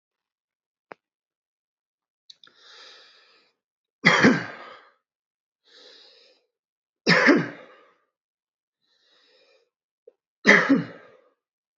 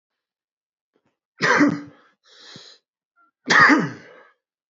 three_cough_length: 11.8 s
three_cough_amplitude: 28360
three_cough_signal_mean_std_ratio: 0.25
cough_length: 4.7 s
cough_amplitude: 26626
cough_signal_mean_std_ratio: 0.33
survey_phase: beta (2021-08-13 to 2022-03-07)
age: 45-64
gender: Male
wearing_mask: 'No'
symptom_cough_any: true
symptom_runny_or_blocked_nose: true
symptom_shortness_of_breath: true
symptom_sore_throat: true
symptom_fever_high_temperature: true
symptom_headache: true
smoker_status: Never smoked
respiratory_condition_asthma: true
respiratory_condition_other: false
recruitment_source: Test and Trace
submission_delay: 2 days
covid_test_result: Positive
covid_test_method: RT-qPCR
covid_ct_value: 19.0
covid_ct_gene: ORF1ab gene
covid_ct_mean: 19.5
covid_viral_load: 400000 copies/ml
covid_viral_load_category: Low viral load (10K-1M copies/ml)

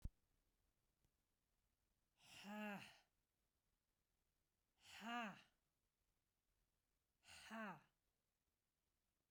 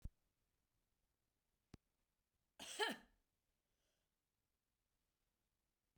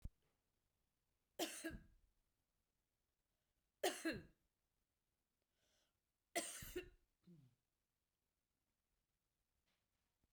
exhalation_length: 9.3 s
exhalation_amplitude: 460
exhalation_signal_mean_std_ratio: 0.33
cough_length: 6.0 s
cough_amplitude: 1623
cough_signal_mean_std_ratio: 0.18
three_cough_length: 10.3 s
three_cough_amplitude: 1483
three_cough_signal_mean_std_ratio: 0.25
survey_phase: beta (2021-08-13 to 2022-03-07)
age: 45-64
gender: Female
wearing_mask: 'No'
symptom_none: true
smoker_status: Never smoked
respiratory_condition_asthma: false
respiratory_condition_other: false
recruitment_source: REACT
submission_delay: 3 days
covid_test_result: Negative
covid_test_method: RT-qPCR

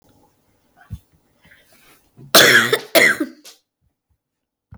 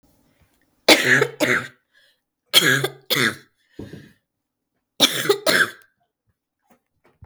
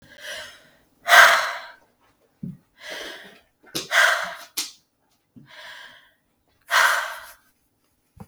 cough_length: 4.8 s
cough_amplitude: 32768
cough_signal_mean_std_ratio: 0.31
three_cough_length: 7.3 s
three_cough_amplitude: 32767
three_cough_signal_mean_std_ratio: 0.37
exhalation_length: 8.3 s
exhalation_amplitude: 32768
exhalation_signal_mean_std_ratio: 0.32
survey_phase: beta (2021-08-13 to 2022-03-07)
age: 18-44
gender: Female
wearing_mask: 'No'
symptom_cough_any: true
symptom_runny_or_blocked_nose: true
symptom_sore_throat: true
symptom_fatigue: true
symptom_other: true
smoker_status: Never smoked
respiratory_condition_asthma: true
respiratory_condition_other: false
recruitment_source: Test and Trace
submission_delay: 1 day
covid_test_result: Positive
covid_test_method: RT-qPCR
covid_ct_value: 20.4
covid_ct_gene: N gene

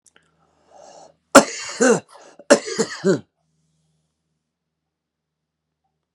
cough_length: 6.1 s
cough_amplitude: 32768
cough_signal_mean_std_ratio: 0.24
survey_phase: beta (2021-08-13 to 2022-03-07)
age: 65+
gender: Male
wearing_mask: 'No'
symptom_new_continuous_cough: true
symptom_runny_or_blocked_nose: true
symptom_sore_throat: true
symptom_fatigue: true
smoker_status: Ex-smoker
respiratory_condition_asthma: false
respiratory_condition_other: false
recruitment_source: Test and Trace
submission_delay: 1 day
covid_test_result: Positive
covid_test_method: RT-qPCR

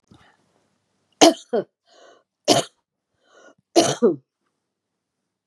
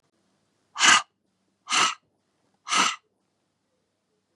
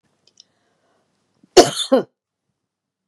three_cough_length: 5.5 s
three_cough_amplitude: 32767
three_cough_signal_mean_std_ratio: 0.26
exhalation_length: 4.4 s
exhalation_amplitude: 25618
exhalation_signal_mean_std_ratio: 0.3
cough_length: 3.1 s
cough_amplitude: 32768
cough_signal_mean_std_ratio: 0.21
survey_phase: beta (2021-08-13 to 2022-03-07)
age: 45-64
gender: Female
wearing_mask: 'No'
symptom_runny_or_blocked_nose: true
symptom_sore_throat: true
symptom_fatigue: true
smoker_status: Ex-smoker
respiratory_condition_asthma: false
respiratory_condition_other: false
recruitment_source: Test and Trace
submission_delay: 0 days
covid_test_result: Positive
covid_test_method: LFT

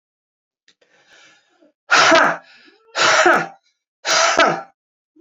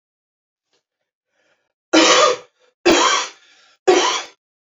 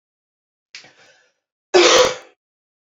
exhalation_length: 5.2 s
exhalation_amplitude: 29328
exhalation_signal_mean_std_ratio: 0.44
three_cough_length: 4.8 s
three_cough_amplitude: 29739
three_cough_signal_mean_std_ratio: 0.41
cough_length: 2.8 s
cough_amplitude: 32502
cough_signal_mean_std_ratio: 0.31
survey_phase: beta (2021-08-13 to 2022-03-07)
age: 45-64
gender: Female
wearing_mask: 'No'
symptom_cough_any: true
symptom_new_continuous_cough: true
symptom_runny_or_blocked_nose: true
symptom_fatigue: true
symptom_headache: true
symptom_onset: 4 days
smoker_status: Never smoked
respiratory_condition_asthma: false
respiratory_condition_other: false
recruitment_source: Test and Trace
submission_delay: 1 day
covid_test_result: Positive
covid_test_method: RT-qPCR
covid_ct_value: 22.3
covid_ct_gene: ORF1ab gene
covid_ct_mean: 22.8
covid_viral_load: 34000 copies/ml
covid_viral_load_category: Low viral load (10K-1M copies/ml)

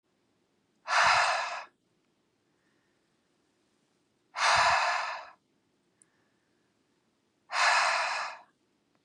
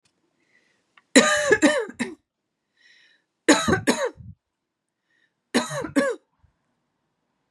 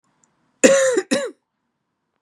exhalation_length: 9.0 s
exhalation_amplitude: 9456
exhalation_signal_mean_std_ratio: 0.41
three_cough_length: 7.5 s
three_cough_amplitude: 31960
three_cough_signal_mean_std_ratio: 0.35
cough_length: 2.2 s
cough_amplitude: 32768
cough_signal_mean_std_ratio: 0.39
survey_phase: beta (2021-08-13 to 2022-03-07)
age: 18-44
gender: Female
wearing_mask: 'No'
symptom_runny_or_blocked_nose: true
symptom_onset: 3 days
smoker_status: Ex-smoker
respiratory_condition_asthma: false
respiratory_condition_other: false
recruitment_source: REACT
submission_delay: 3 days
covid_test_result: Negative
covid_test_method: RT-qPCR
influenza_a_test_result: Negative
influenza_b_test_result: Negative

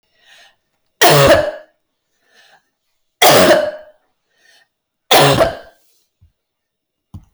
three_cough_length: 7.3 s
three_cough_amplitude: 32768
three_cough_signal_mean_std_ratio: 0.38
survey_phase: beta (2021-08-13 to 2022-03-07)
age: 65+
gender: Female
wearing_mask: 'No'
symptom_none: true
smoker_status: Never smoked
respiratory_condition_asthma: false
respiratory_condition_other: false
recruitment_source: REACT
submission_delay: 15 days
covid_test_result: Negative
covid_test_method: RT-qPCR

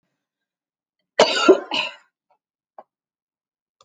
cough_length: 3.8 s
cough_amplitude: 27935
cough_signal_mean_std_ratio: 0.26
survey_phase: beta (2021-08-13 to 2022-03-07)
age: 45-64
gender: Female
wearing_mask: 'No'
symptom_none: true
smoker_status: Never smoked
respiratory_condition_asthma: false
respiratory_condition_other: false
recruitment_source: REACT
submission_delay: 6 days
covid_test_result: Negative
covid_test_method: RT-qPCR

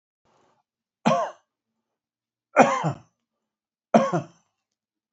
three_cough_length: 5.1 s
three_cough_amplitude: 26549
three_cough_signal_mean_std_ratio: 0.28
survey_phase: beta (2021-08-13 to 2022-03-07)
age: 65+
gender: Male
wearing_mask: 'Yes'
symptom_none: true
smoker_status: Ex-smoker
respiratory_condition_asthma: false
respiratory_condition_other: false
recruitment_source: REACT
submission_delay: 1 day
covid_test_result: Negative
covid_test_method: RT-qPCR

